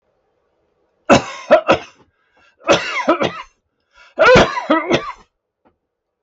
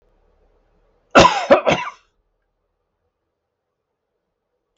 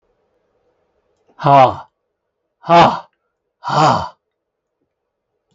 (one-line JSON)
{"three_cough_length": "6.2 s", "three_cough_amplitude": 32768, "three_cough_signal_mean_std_ratio": 0.4, "cough_length": "4.8 s", "cough_amplitude": 32768, "cough_signal_mean_std_ratio": 0.25, "exhalation_length": "5.5 s", "exhalation_amplitude": 32766, "exhalation_signal_mean_std_ratio": 0.33, "survey_phase": "beta (2021-08-13 to 2022-03-07)", "age": "65+", "gender": "Male", "wearing_mask": "No", "symptom_none": true, "smoker_status": "Never smoked", "respiratory_condition_asthma": false, "respiratory_condition_other": false, "recruitment_source": "REACT", "submission_delay": "1 day", "covid_test_result": "Negative", "covid_test_method": "RT-qPCR", "influenza_a_test_result": "Negative", "influenza_b_test_result": "Negative"}